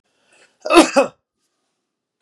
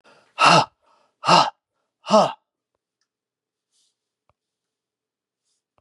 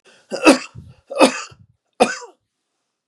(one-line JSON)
{"cough_length": "2.2 s", "cough_amplitude": 32768, "cough_signal_mean_std_ratio": 0.28, "exhalation_length": "5.8 s", "exhalation_amplitude": 30247, "exhalation_signal_mean_std_ratio": 0.26, "three_cough_length": "3.1 s", "three_cough_amplitude": 32768, "three_cough_signal_mean_std_ratio": 0.31, "survey_phase": "beta (2021-08-13 to 2022-03-07)", "age": "65+", "gender": "Male", "wearing_mask": "No", "symptom_none": true, "smoker_status": "Never smoked", "respiratory_condition_asthma": false, "respiratory_condition_other": false, "recruitment_source": "REACT", "submission_delay": "9 days", "covid_test_result": "Negative", "covid_test_method": "RT-qPCR", "influenza_a_test_result": "Unknown/Void", "influenza_b_test_result": "Unknown/Void"}